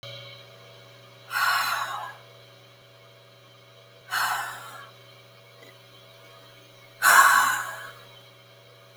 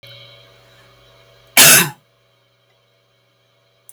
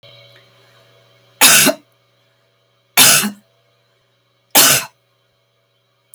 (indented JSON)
{
  "exhalation_length": "9.0 s",
  "exhalation_amplitude": 20382,
  "exhalation_signal_mean_std_ratio": 0.38,
  "cough_length": "3.9 s",
  "cough_amplitude": 32768,
  "cough_signal_mean_std_ratio": 0.24,
  "three_cough_length": "6.1 s",
  "three_cough_amplitude": 32768,
  "three_cough_signal_mean_std_ratio": 0.32,
  "survey_phase": "alpha (2021-03-01 to 2021-08-12)",
  "age": "65+",
  "gender": "Female",
  "wearing_mask": "No",
  "symptom_none": true,
  "symptom_onset": "12 days",
  "smoker_status": "Never smoked",
  "respiratory_condition_asthma": false,
  "respiratory_condition_other": false,
  "recruitment_source": "REACT",
  "submission_delay": "1 day",
  "covid_test_result": "Negative",
  "covid_test_method": "RT-qPCR"
}